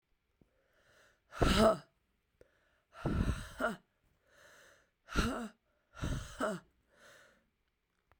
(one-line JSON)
{"exhalation_length": "8.2 s", "exhalation_amplitude": 5770, "exhalation_signal_mean_std_ratio": 0.35, "survey_phase": "beta (2021-08-13 to 2022-03-07)", "age": "18-44", "gender": "Female", "wearing_mask": "No", "symptom_cough_any": true, "symptom_new_continuous_cough": true, "symptom_runny_or_blocked_nose": true, "symptom_sore_throat": true, "symptom_fatigue": true, "symptom_fever_high_temperature": true, "symptom_headache": true, "symptom_change_to_sense_of_smell_or_taste": true, "symptom_loss_of_taste": true, "symptom_onset": "5 days", "smoker_status": "Never smoked", "respiratory_condition_asthma": false, "respiratory_condition_other": false, "recruitment_source": "Test and Trace", "submission_delay": "1 day", "covid_test_result": "Positive", "covid_test_method": "RT-qPCR", "covid_ct_value": 15.0, "covid_ct_gene": "ORF1ab gene", "covid_ct_mean": 15.2, "covid_viral_load": "10000000 copies/ml", "covid_viral_load_category": "High viral load (>1M copies/ml)"}